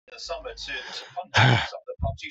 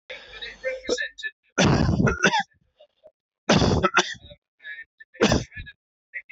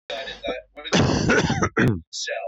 {"exhalation_length": "2.3 s", "exhalation_amplitude": 20524, "exhalation_signal_mean_std_ratio": 0.52, "three_cough_length": "6.3 s", "three_cough_amplitude": 18348, "three_cough_signal_mean_std_ratio": 0.48, "cough_length": "2.5 s", "cough_amplitude": 14418, "cough_signal_mean_std_ratio": 0.72, "survey_phase": "beta (2021-08-13 to 2022-03-07)", "age": "45-64", "gender": "Male", "wearing_mask": "No", "symptom_cough_any": true, "symptom_runny_or_blocked_nose": true, "symptom_sore_throat": true, "symptom_diarrhoea": true, "symptom_fatigue": true, "symptom_fever_high_temperature": true, "symptom_headache": true, "symptom_change_to_sense_of_smell_or_taste": true, "symptom_loss_of_taste": true, "smoker_status": "Never smoked", "respiratory_condition_asthma": false, "respiratory_condition_other": false, "recruitment_source": "Test and Trace", "submission_delay": "2 days", "covid_test_result": "Positive", "covid_test_method": "LFT"}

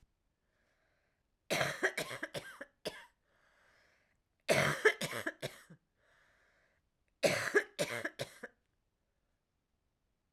{"three_cough_length": "10.3 s", "three_cough_amplitude": 6550, "three_cough_signal_mean_std_ratio": 0.33, "survey_phase": "alpha (2021-03-01 to 2021-08-12)", "age": "45-64", "gender": "Female", "wearing_mask": "Yes", "symptom_cough_any": true, "symptom_shortness_of_breath": true, "symptom_headache": true, "symptom_change_to_sense_of_smell_or_taste": true, "symptom_loss_of_taste": true, "symptom_onset": "4 days", "smoker_status": "Never smoked", "respiratory_condition_asthma": false, "respiratory_condition_other": false, "recruitment_source": "Test and Trace", "submission_delay": "2 days", "covid_test_result": "Positive", "covid_test_method": "RT-qPCR", "covid_ct_value": 16.3, "covid_ct_gene": "ORF1ab gene", "covid_ct_mean": 16.7, "covid_viral_load": "3200000 copies/ml", "covid_viral_load_category": "High viral load (>1M copies/ml)"}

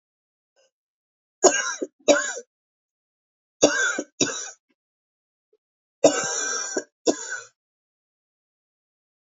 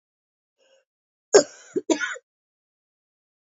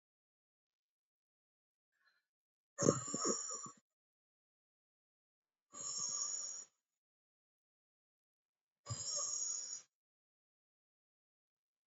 {"three_cough_length": "9.3 s", "three_cough_amplitude": 27078, "three_cough_signal_mean_std_ratio": 0.32, "cough_length": "3.6 s", "cough_amplitude": 27384, "cough_signal_mean_std_ratio": 0.2, "exhalation_length": "11.9 s", "exhalation_amplitude": 6856, "exhalation_signal_mean_std_ratio": 0.33, "survey_phase": "beta (2021-08-13 to 2022-03-07)", "age": "45-64", "gender": "Female", "wearing_mask": "No", "symptom_cough_any": true, "symptom_new_continuous_cough": true, "symptom_runny_or_blocked_nose": true, "symptom_shortness_of_breath": true, "symptom_abdominal_pain": true, "symptom_fatigue": true, "symptom_headache": true, "symptom_change_to_sense_of_smell_or_taste": true, "symptom_loss_of_taste": true, "symptom_other": true, "symptom_onset": "2 days", "smoker_status": "Ex-smoker", "respiratory_condition_asthma": true, "respiratory_condition_other": false, "recruitment_source": "Test and Trace", "submission_delay": "1 day", "covid_test_result": "Positive", "covid_test_method": "RT-qPCR", "covid_ct_value": 13.5, "covid_ct_gene": "ORF1ab gene", "covid_ct_mean": 14.1, "covid_viral_load": "24000000 copies/ml", "covid_viral_load_category": "High viral load (>1M copies/ml)"}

